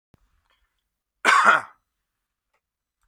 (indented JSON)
{
  "cough_length": "3.1 s",
  "cough_amplitude": 27857,
  "cough_signal_mean_std_ratio": 0.27,
  "survey_phase": "beta (2021-08-13 to 2022-03-07)",
  "age": "45-64",
  "gender": "Male",
  "wearing_mask": "No",
  "symptom_none": true,
  "smoker_status": "Never smoked",
  "respiratory_condition_asthma": false,
  "respiratory_condition_other": false,
  "recruitment_source": "REACT",
  "submission_delay": "3 days",
  "covid_test_result": "Negative",
  "covid_test_method": "RT-qPCR",
  "influenza_a_test_result": "Negative",
  "influenza_b_test_result": "Negative"
}